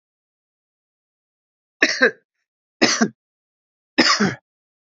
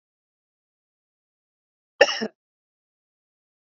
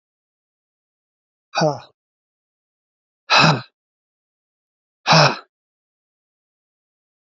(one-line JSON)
{"three_cough_length": "4.9 s", "three_cough_amplitude": 32767, "three_cough_signal_mean_std_ratio": 0.3, "cough_length": "3.7 s", "cough_amplitude": 32767, "cough_signal_mean_std_ratio": 0.14, "exhalation_length": "7.3 s", "exhalation_amplitude": 32768, "exhalation_signal_mean_std_ratio": 0.25, "survey_phase": "beta (2021-08-13 to 2022-03-07)", "age": "18-44", "gender": "Male", "wearing_mask": "No", "symptom_cough_any": true, "symptom_new_continuous_cough": true, "symptom_runny_or_blocked_nose": true, "symptom_shortness_of_breath": true, "symptom_sore_throat": true, "symptom_fatigue": true, "symptom_headache": true, "symptom_change_to_sense_of_smell_or_taste": true, "symptom_other": true, "symptom_onset": "3 days", "smoker_status": "Never smoked", "respiratory_condition_asthma": false, "respiratory_condition_other": false, "recruitment_source": "Test and Trace", "submission_delay": "2 days", "covid_test_result": "Positive", "covid_test_method": "RT-qPCR", "covid_ct_value": 27.6, "covid_ct_gene": "ORF1ab gene"}